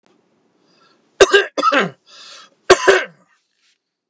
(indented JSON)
{
  "cough_length": "4.1 s",
  "cough_amplitude": 29204,
  "cough_signal_mean_std_ratio": 0.33,
  "survey_phase": "beta (2021-08-13 to 2022-03-07)",
  "age": "65+",
  "gender": "Male",
  "wearing_mask": "No",
  "symptom_none": true,
  "smoker_status": "Never smoked",
  "respiratory_condition_asthma": false,
  "respiratory_condition_other": false,
  "recruitment_source": "REACT",
  "submission_delay": "6 days",
  "covid_test_result": "Negative",
  "covid_test_method": "RT-qPCR"
}